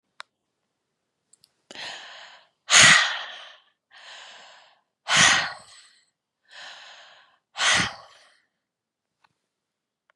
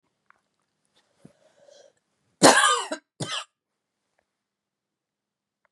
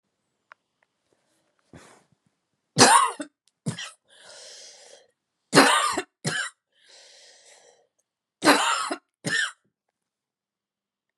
exhalation_length: 10.2 s
exhalation_amplitude: 30892
exhalation_signal_mean_std_ratio: 0.28
cough_length: 5.7 s
cough_amplitude: 29075
cough_signal_mean_std_ratio: 0.22
three_cough_length: 11.2 s
three_cough_amplitude: 32561
three_cough_signal_mean_std_ratio: 0.3
survey_phase: beta (2021-08-13 to 2022-03-07)
age: 18-44
gender: Female
wearing_mask: 'No'
symptom_none: true
smoker_status: Never smoked
respiratory_condition_asthma: false
respiratory_condition_other: false
recruitment_source: REACT
submission_delay: 1 day
covid_test_result: Negative
covid_test_method: RT-qPCR
influenza_a_test_result: Negative
influenza_b_test_result: Negative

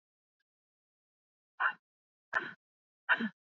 exhalation_length: 3.5 s
exhalation_amplitude: 6064
exhalation_signal_mean_std_ratio: 0.26
survey_phase: beta (2021-08-13 to 2022-03-07)
age: 18-44
gender: Female
wearing_mask: 'No'
symptom_cough_any: true
symptom_shortness_of_breath: true
symptom_sore_throat: true
symptom_diarrhoea: true
symptom_fatigue: true
symptom_headache: true
symptom_onset: 13 days
smoker_status: Never smoked
respiratory_condition_asthma: false
respiratory_condition_other: false
recruitment_source: REACT
submission_delay: 4 days
covid_test_result: Negative
covid_test_method: RT-qPCR
influenza_a_test_result: Negative
influenza_b_test_result: Negative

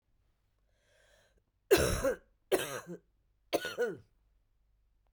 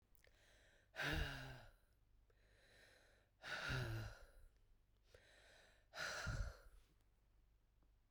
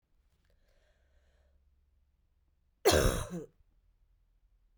three_cough_length: 5.1 s
three_cough_amplitude: 8071
three_cough_signal_mean_std_ratio: 0.33
exhalation_length: 8.1 s
exhalation_amplitude: 939
exhalation_signal_mean_std_ratio: 0.47
cough_length: 4.8 s
cough_amplitude: 8083
cough_signal_mean_std_ratio: 0.25
survey_phase: beta (2021-08-13 to 2022-03-07)
age: 45-64
gender: Female
wearing_mask: 'No'
symptom_cough_any: true
symptom_runny_or_blocked_nose: true
symptom_sore_throat: true
symptom_fatigue: true
symptom_fever_high_temperature: true
symptom_headache: true
symptom_change_to_sense_of_smell_or_taste: true
symptom_loss_of_taste: true
symptom_other: true
symptom_onset: 3 days
smoker_status: Never smoked
respiratory_condition_asthma: false
respiratory_condition_other: false
recruitment_source: Test and Trace
submission_delay: 1 day
covid_test_result: Positive
covid_test_method: RT-qPCR
covid_ct_value: 11.9
covid_ct_gene: ORF1ab gene
covid_ct_mean: 12.5
covid_viral_load: 81000000 copies/ml
covid_viral_load_category: High viral load (>1M copies/ml)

